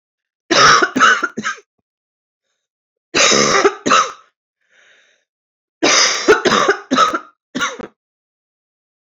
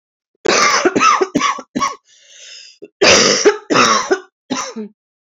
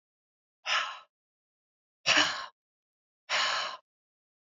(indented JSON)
{
  "three_cough_length": "9.1 s",
  "three_cough_amplitude": 32768,
  "three_cough_signal_mean_std_ratio": 0.46,
  "cough_length": "5.4 s",
  "cough_amplitude": 32555,
  "cough_signal_mean_std_ratio": 0.56,
  "exhalation_length": "4.4 s",
  "exhalation_amplitude": 11122,
  "exhalation_signal_mean_std_ratio": 0.37,
  "survey_phase": "beta (2021-08-13 to 2022-03-07)",
  "age": "45-64",
  "gender": "Female",
  "wearing_mask": "No",
  "symptom_cough_any": true,
  "symptom_new_continuous_cough": true,
  "symptom_runny_or_blocked_nose": true,
  "symptom_fatigue": true,
  "symptom_headache": true,
  "symptom_other": true,
  "symptom_onset": "8 days",
  "smoker_status": "Never smoked",
  "respiratory_condition_asthma": false,
  "respiratory_condition_other": false,
  "recruitment_source": "Test and Trace",
  "submission_delay": "2 days",
  "covid_test_result": "Positive",
  "covid_test_method": "RT-qPCR",
  "covid_ct_value": 36.1,
  "covid_ct_gene": "N gene"
}